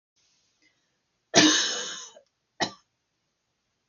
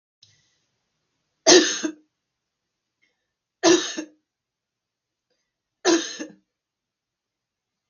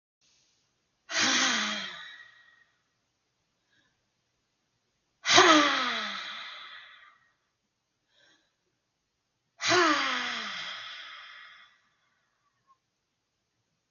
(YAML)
cough_length: 3.9 s
cough_amplitude: 22931
cough_signal_mean_std_ratio: 0.29
three_cough_length: 7.9 s
three_cough_amplitude: 32768
three_cough_signal_mean_std_ratio: 0.24
exhalation_length: 13.9 s
exhalation_amplitude: 21984
exhalation_signal_mean_std_ratio: 0.34
survey_phase: beta (2021-08-13 to 2022-03-07)
age: 45-64
gender: Female
wearing_mask: 'No'
symptom_none: true
smoker_status: Never smoked
respiratory_condition_asthma: false
respiratory_condition_other: false
recruitment_source: REACT
submission_delay: 1 day
covid_test_result: Negative
covid_test_method: RT-qPCR
influenza_a_test_result: Negative
influenza_b_test_result: Negative